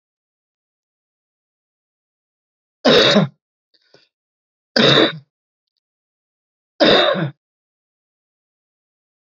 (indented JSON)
{
  "three_cough_length": "9.3 s",
  "three_cough_amplitude": 32767,
  "three_cough_signal_mean_std_ratio": 0.29,
  "survey_phase": "beta (2021-08-13 to 2022-03-07)",
  "age": "45-64",
  "gender": "Male",
  "wearing_mask": "No",
  "symptom_none": true,
  "smoker_status": "Never smoked",
  "respiratory_condition_asthma": false,
  "respiratory_condition_other": false,
  "recruitment_source": "REACT",
  "submission_delay": "3 days",
  "covid_test_result": "Negative",
  "covid_test_method": "RT-qPCR",
  "influenza_a_test_result": "Negative",
  "influenza_b_test_result": "Negative"
}